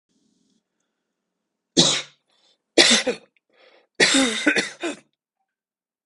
{"three_cough_length": "6.1 s", "three_cough_amplitude": 32768, "three_cough_signal_mean_std_ratio": 0.35, "survey_phase": "beta (2021-08-13 to 2022-03-07)", "age": "18-44", "gender": "Male", "wearing_mask": "No", "symptom_none": true, "smoker_status": "Ex-smoker", "respiratory_condition_asthma": false, "respiratory_condition_other": false, "recruitment_source": "REACT", "submission_delay": "1 day", "covid_test_result": "Negative", "covid_test_method": "RT-qPCR"}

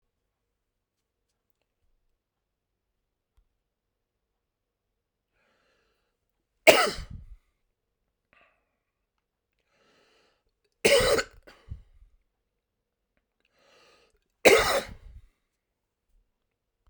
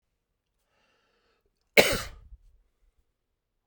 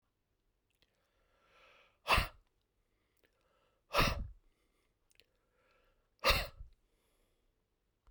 {"three_cough_length": "16.9 s", "three_cough_amplitude": 32767, "three_cough_signal_mean_std_ratio": 0.19, "cough_length": "3.7 s", "cough_amplitude": 25613, "cough_signal_mean_std_ratio": 0.18, "exhalation_length": "8.1 s", "exhalation_amplitude": 5270, "exhalation_signal_mean_std_ratio": 0.24, "survey_phase": "beta (2021-08-13 to 2022-03-07)", "age": "45-64", "gender": "Male", "wearing_mask": "No", "symptom_cough_any": true, "symptom_runny_or_blocked_nose": true, "symptom_sore_throat": true, "symptom_fatigue": true, "symptom_headache": true, "symptom_change_to_sense_of_smell_or_taste": true, "symptom_loss_of_taste": true, "symptom_onset": "3 days", "smoker_status": "Never smoked", "respiratory_condition_asthma": false, "respiratory_condition_other": false, "recruitment_source": "Test and Trace", "submission_delay": "2 days", "covid_test_result": "Positive", "covid_test_method": "RT-qPCR", "covid_ct_value": 16.0, "covid_ct_gene": "N gene", "covid_ct_mean": 16.8, "covid_viral_load": "3100000 copies/ml", "covid_viral_load_category": "High viral load (>1M copies/ml)"}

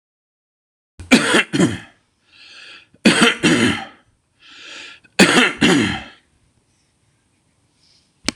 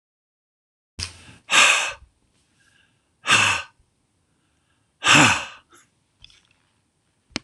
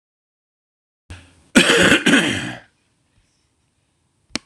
{"three_cough_length": "8.4 s", "three_cough_amplitude": 26028, "three_cough_signal_mean_std_ratio": 0.4, "exhalation_length": "7.4 s", "exhalation_amplitude": 25866, "exhalation_signal_mean_std_ratio": 0.31, "cough_length": "4.5 s", "cough_amplitude": 26028, "cough_signal_mean_std_ratio": 0.35, "survey_phase": "beta (2021-08-13 to 2022-03-07)", "age": "45-64", "gender": "Male", "wearing_mask": "No", "symptom_none": true, "smoker_status": "Current smoker (e-cigarettes or vapes only)", "respiratory_condition_asthma": false, "respiratory_condition_other": false, "recruitment_source": "REACT", "submission_delay": "4 days", "covid_test_result": "Negative", "covid_test_method": "RT-qPCR"}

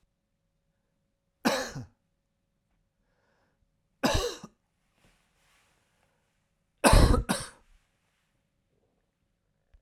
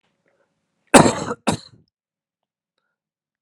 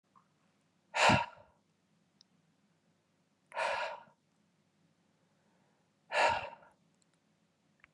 {"three_cough_length": "9.8 s", "three_cough_amplitude": 19134, "three_cough_signal_mean_std_ratio": 0.23, "cough_length": "3.4 s", "cough_amplitude": 32768, "cough_signal_mean_std_ratio": 0.22, "exhalation_length": "7.9 s", "exhalation_amplitude": 7102, "exhalation_signal_mean_std_ratio": 0.28, "survey_phase": "beta (2021-08-13 to 2022-03-07)", "age": "18-44", "gender": "Male", "wearing_mask": "No", "symptom_none": true, "symptom_onset": "10 days", "smoker_status": "Ex-smoker", "respiratory_condition_asthma": false, "respiratory_condition_other": false, "recruitment_source": "REACT", "submission_delay": "2 days", "covid_test_result": "Negative", "covid_test_method": "RT-qPCR"}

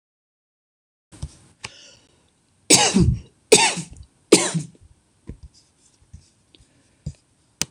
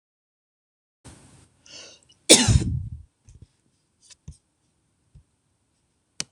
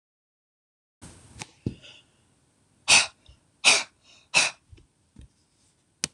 {"three_cough_length": "7.7 s", "three_cough_amplitude": 26028, "three_cough_signal_mean_std_ratio": 0.28, "cough_length": "6.3 s", "cough_amplitude": 26028, "cough_signal_mean_std_ratio": 0.21, "exhalation_length": "6.1 s", "exhalation_amplitude": 21848, "exhalation_signal_mean_std_ratio": 0.24, "survey_phase": "beta (2021-08-13 to 2022-03-07)", "age": "65+", "gender": "Female", "wearing_mask": "No", "symptom_sore_throat": true, "smoker_status": "Ex-smoker", "respiratory_condition_asthma": false, "respiratory_condition_other": false, "recruitment_source": "REACT", "submission_delay": "1 day", "covid_test_result": "Negative", "covid_test_method": "RT-qPCR"}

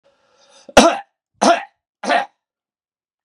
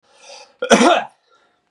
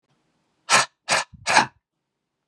{"three_cough_length": "3.2 s", "three_cough_amplitude": 32768, "three_cough_signal_mean_std_ratio": 0.31, "cough_length": "1.7 s", "cough_amplitude": 32768, "cough_signal_mean_std_ratio": 0.38, "exhalation_length": "2.5 s", "exhalation_amplitude": 29962, "exhalation_signal_mean_std_ratio": 0.34, "survey_phase": "beta (2021-08-13 to 2022-03-07)", "age": "45-64", "gender": "Male", "wearing_mask": "No", "symptom_cough_any": true, "symptom_runny_or_blocked_nose": true, "symptom_sore_throat": true, "smoker_status": "Never smoked", "respiratory_condition_asthma": false, "respiratory_condition_other": false, "recruitment_source": "Test and Trace", "submission_delay": "1 day", "covid_test_result": "Positive", "covid_test_method": "RT-qPCR"}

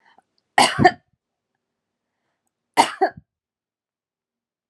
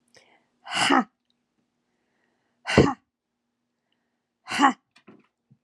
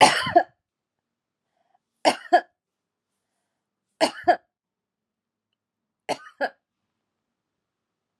{"cough_length": "4.7 s", "cough_amplitude": 30938, "cough_signal_mean_std_ratio": 0.23, "exhalation_length": "5.6 s", "exhalation_amplitude": 26796, "exhalation_signal_mean_std_ratio": 0.27, "three_cough_length": "8.2 s", "three_cough_amplitude": 31685, "three_cough_signal_mean_std_ratio": 0.23, "survey_phase": "alpha (2021-03-01 to 2021-08-12)", "age": "18-44", "gender": "Female", "wearing_mask": "No", "symptom_none": true, "smoker_status": "Never smoked", "respiratory_condition_asthma": true, "respiratory_condition_other": false, "recruitment_source": "REACT", "submission_delay": "3 days", "covid_test_result": "Negative", "covid_test_method": "RT-qPCR"}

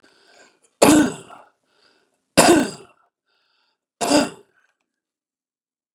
{"three_cough_length": "5.9 s", "three_cough_amplitude": 32767, "three_cough_signal_mean_std_ratio": 0.29, "survey_phase": "beta (2021-08-13 to 2022-03-07)", "age": "65+", "gender": "Male", "wearing_mask": "No", "symptom_none": true, "smoker_status": "Ex-smoker", "respiratory_condition_asthma": false, "respiratory_condition_other": false, "recruitment_source": "REACT", "submission_delay": "3 days", "covid_test_result": "Negative", "covid_test_method": "RT-qPCR", "influenza_a_test_result": "Negative", "influenza_b_test_result": "Negative"}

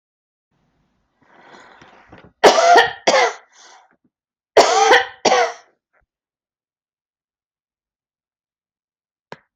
{"cough_length": "9.6 s", "cough_amplitude": 30890, "cough_signal_mean_std_ratio": 0.31, "survey_phase": "alpha (2021-03-01 to 2021-08-12)", "age": "45-64", "gender": "Female", "wearing_mask": "Yes", "symptom_fatigue": true, "symptom_headache": true, "symptom_onset": "5 days", "smoker_status": "Never smoked", "respiratory_condition_asthma": true, "respiratory_condition_other": false, "recruitment_source": "REACT", "submission_delay": "2 days", "covid_test_result": "Negative", "covid_test_method": "RT-qPCR"}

